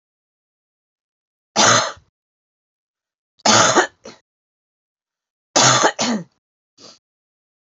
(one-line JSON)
{"three_cough_length": "7.7 s", "three_cough_amplitude": 32767, "three_cough_signal_mean_std_ratio": 0.33, "survey_phase": "beta (2021-08-13 to 2022-03-07)", "age": "65+", "gender": "Female", "wearing_mask": "No", "symptom_cough_any": true, "symptom_runny_or_blocked_nose": true, "smoker_status": "Never smoked", "respiratory_condition_asthma": false, "respiratory_condition_other": false, "recruitment_source": "REACT", "submission_delay": "2 days", "covid_test_result": "Negative", "covid_test_method": "RT-qPCR", "influenza_a_test_result": "Negative", "influenza_b_test_result": "Negative"}